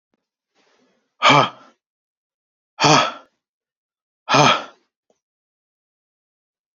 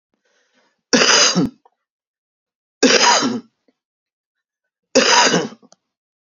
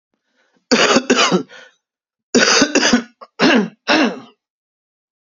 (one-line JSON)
{"exhalation_length": "6.7 s", "exhalation_amplitude": 30314, "exhalation_signal_mean_std_ratio": 0.28, "three_cough_length": "6.4 s", "three_cough_amplitude": 32767, "three_cough_signal_mean_std_ratio": 0.41, "cough_length": "5.2 s", "cough_amplitude": 32767, "cough_signal_mean_std_ratio": 0.5, "survey_phase": "beta (2021-08-13 to 2022-03-07)", "age": "45-64", "gender": "Male", "wearing_mask": "No", "symptom_cough_any": true, "symptom_runny_or_blocked_nose": true, "symptom_fatigue": true, "symptom_headache": true, "symptom_onset": "5 days", "smoker_status": "Ex-smoker", "respiratory_condition_asthma": false, "respiratory_condition_other": false, "recruitment_source": "Test and Trace", "submission_delay": "2 days", "covid_test_result": "Positive", "covid_test_method": "RT-qPCR", "covid_ct_value": 20.7, "covid_ct_gene": "N gene"}